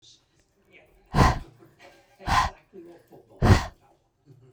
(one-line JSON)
{"exhalation_length": "4.5 s", "exhalation_amplitude": 22889, "exhalation_signal_mean_std_ratio": 0.32, "survey_phase": "beta (2021-08-13 to 2022-03-07)", "age": "18-44", "gender": "Female", "wearing_mask": "No", "symptom_none": true, "smoker_status": "Never smoked", "respiratory_condition_asthma": false, "respiratory_condition_other": false, "recruitment_source": "REACT", "submission_delay": "1 day", "covid_test_result": "Negative", "covid_test_method": "RT-qPCR"}